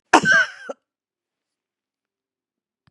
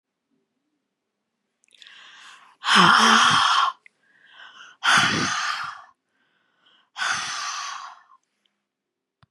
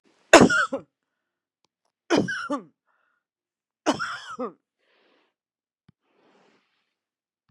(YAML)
cough_length: 2.9 s
cough_amplitude: 32767
cough_signal_mean_std_ratio: 0.27
exhalation_length: 9.3 s
exhalation_amplitude: 24518
exhalation_signal_mean_std_ratio: 0.41
three_cough_length: 7.5 s
three_cough_amplitude: 32767
three_cough_signal_mean_std_ratio: 0.24
survey_phase: beta (2021-08-13 to 2022-03-07)
age: 65+
gender: Female
wearing_mask: 'No'
symptom_none: true
smoker_status: Ex-smoker
respiratory_condition_asthma: false
respiratory_condition_other: false
recruitment_source: REACT
submission_delay: 2 days
covid_test_result: Negative
covid_test_method: RT-qPCR
influenza_a_test_result: Negative
influenza_b_test_result: Negative